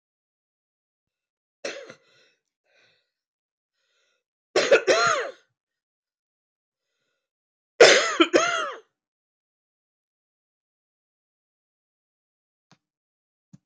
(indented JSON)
{
  "three_cough_length": "13.7 s",
  "three_cough_amplitude": 25427,
  "three_cough_signal_mean_std_ratio": 0.23,
  "survey_phase": "beta (2021-08-13 to 2022-03-07)",
  "age": "65+",
  "gender": "Female",
  "wearing_mask": "No",
  "symptom_cough_any": true,
  "symptom_runny_or_blocked_nose": true,
  "symptom_shortness_of_breath": true,
  "symptom_sore_throat": true,
  "symptom_fatigue": true,
  "symptom_fever_high_temperature": true,
  "symptom_headache": true,
  "symptom_change_to_sense_of_smell_or_taste": true,
  "symptom_loss_of_taste": true,
  "symptom_onset": "7 days",
  "smoker_status": "Current smoker (e-cigarettes or vapes only)",
  "respiratory_condition_asthma": false,
  "respiratory_condition_other": false,
  "recruitment_source": "Test and Trace",
  "submission_delay": "2 days",
  "covid_test_result": "Positive",
  "covid_test_method": "RT-qPCR",
  "covid_ct_value": 12.1,
  "covid_ct_gene": "N gene",
  "covid_ct_mean": 12.5,
  "covid_viral_load": "78000000 copies/ml",
  "covid_viral_load_category": "High viral load (>1M copies/ml)"
}